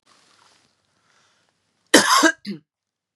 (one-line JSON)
{"cough_length": "3.2 s", "cough_amplitude": 32733, "cough_signal_mean_std_ratio": 0.28, "survey_phase": "beta (2021-08-13 to 2022-03-07)", "age": "45-64", "gender": "Female", "wearing_mask": "No", "symptom_runny_or_blocked_nose": true, "symptom_sore_throat": true, "symptom_fatigue": true, "symptom_headache": true, "symptom_change_to_sense_of_smell_or_taste": true, "smoker_status": "Ex-smoker", "respiratory_condition_asthma": false, "respiratory_condition_other": false, "recruitment_source": "Test and Trace", "submission_delay": "2 days", "covid_test_result": "Positive", "covid_test_method": "RT-qPCR", "covid_ct_value": 22.6, "covid_ct_gene": "ORF1ab gene", "covid_ct_mean": 23.3, "covid_viral_load": "22000 copies/ml", "covid_viral_load_category": "Low viral load (10K-1M copies/ml)"}